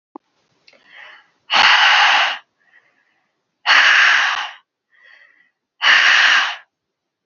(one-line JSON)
{"exhalation_length": "7.3 s", "exhalation_amplitude": 31996, "exhalation_signal_mean_std_ratio": 0.49, "survey_phase": "alpha (2021-03-01 to 2021-08-12)", "age": "18-44", "gender": "Female", "wearing_mask": "No", "symptom_none": true, "smoker_status": "Never smoked", "respiratory_condition_asthma": false, "respiratory_condition_other": false, "recruitment_source": "REACT", "submission_delay": "1 day", "covid_test_result": "Negative", "covid_test_method": "RT-qPCR"}